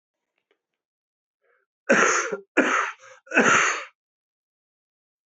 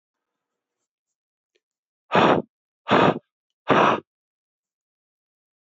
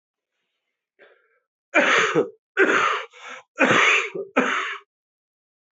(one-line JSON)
{"cough_length": "5.4 s", "cough_amplitude": 26549, "cough_signal_mean_std_ratio": 0.38, "exhalation_length": "5.7 s", "exhalation_amplitude": 22068, "exhalation_signal_mean_std_ratio": 0.3, "three_cough_length": "5.7 s", "three_cough_amplitude": 22652, "three_cough_signal_mean_std_ratio": 0.48, "survey_phase": "beta (2021-08-13 to 2022-03-07)", "age": "45-64", "gender": "Male", "wearing_mask": "No", "symptom_cough_any": true, "symptom_runny_or_blocked_nose": true, "symptom_diarrhoea": true, "symptom_onset": "4 days", "smoker_status": "Current smoker (11 or more cigarettes per day)", "respiratory_condition_asthma": false, "respiratory_condition_other": false, "recruitment_source": "Test and Trace", "submission_delay": "2 days", "covid_test_result": "Positive", "covid_test_method": "RT-qPCR"}